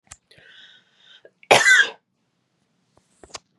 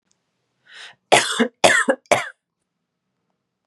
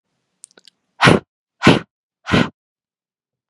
{"cough_length": "3.6 s", "cough_amplitude": 32767, "cough_signal_mean_std_ratio": 0.26, "three_cough_length": "3.7 s", "three_cough_amplitude": 32767, "three_cough_signal_mean_std_ratio": 0.33, "exhalation_length": "3.5 s", "exhalation_amplitude": 32768, "exhalation_signal_mean_std_ratio": 0.28, "survey_phase": "beta (2021-08-13 to 2022-03-07)", "age": "18-44", "gender": "Female", "wearing_mask": "No", "symptom_fatigue": true, "smoker_status": "Never smoked", "respiratory_condition_asthma": false, "respiratory_condition_other": false, "recruitment_source": "REACT", "submission_delay": "2 days", "covid_test_result": "Negative", "covid_test_method": "RT-qPCR", "influenza_a_test_result": "Negative", "influenza_b_test_result": "Negative"}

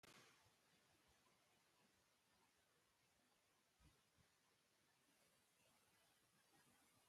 {"exhalation_length": "7.1 s", "exhalation_amplitude": 64, "exhalation_signal_mean_std_ratio": 0.86, "survey_phase": "beta (2021-08-13 to 2022-03-07)", "age": "65+", "gender": "Male", "wearing_mask": "No", "symptom_none": true, "smoker_status": "Never smoked", "respiratory_condition_asthma": false, "respiratory_condition_other": false, "recruitment_source": "REACT", "submission_delay": "3 days", "covid_test_result": "Negative", "covid_test_method": "RT-qPCR"}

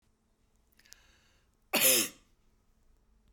{"cough_length": "3.3 s", "cough_amplitude": 8606, "cough_signal_mean_std_ratio": 0.27, "survey_phase": "beta (2021-08-13 to 2022-03-07)", "age": "65+", "gender": "Female", "wearing_mask": "No", "symptom_none": true, "smoker_status": "Never smoked", "respiratory_condition_asthma": false, "respiratory_condition_other": false, "recruitment_source": "REACT", "submission_delay": "1 day", "covid_test_result": "Negative", "covid_test_method": "RT-qPCR"}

